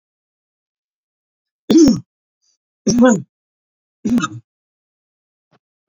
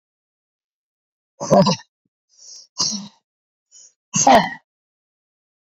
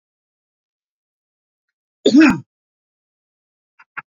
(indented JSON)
{
  "three_cough_length": "5.9 s",
  "three_cough_amplitude": 27142,
  "three_cough_signal_mean_std_ratio": 0.31,
  "exhalation_length": "5.6 s",
  "exhalation_amplitude": 28628,
  "exhalation_signal_mean_std_ratio": 0.29,
  "cough_length": "4.1 s",
  "cough_amplitude": 27579,
  "cough_signal_mean_std_ratio": 0.22,
  "survey_phase": "beta (2021-08-13 to 2022-03-07)",
  "age": "65+",
  "gender": "Male",
  "wearing_mask": "No",
  "symptom_none": true,
  "smoker_status": "Never smoked",
  "respiratory_condition_asthma": false,
  "respiratory_condition_other": false,
  "recruitment_source": "REACT",
  "submission_delay": "2 days",
  "covid_test_result": "Negative",
  "covid_test_method": "RT-qPCR",
  "influenza_a_test_result": "Negative",
  "influenza_b_test_result": "Negative"
}